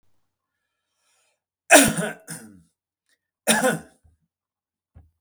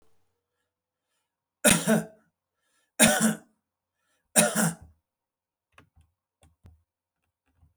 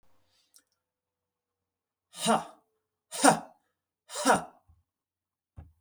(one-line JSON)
{"cough_length": "5.2 s", "cough_amplitude": 32306, "cough_signal_mean_std_ratio": 0.25, "three_cough_length": "7.8 s", "three_cough_amplitude": 30831, "three_cough_signal_mean_std_ratio": 0.28, "exhalation_length": "5.8 s", "exhalation_amplitude": 14340, "exhalation_signal_mean_std_ratio": 0.25, "survey_phase": "alpha (2021-03-01 to 2021-08-12)", "age": "65+", "gender": "Male", "wearing_mask": "No", "symptom_none": true, "smoker_status": "Ex-smoker", "respiratory_condition_asthma": false, "respiratory_condition_other": false, "recruitment_source": "REACT", "submission_delay": "1 day", "covid_test_result": "Negative", "covid_test_method": "RT-qPCR"}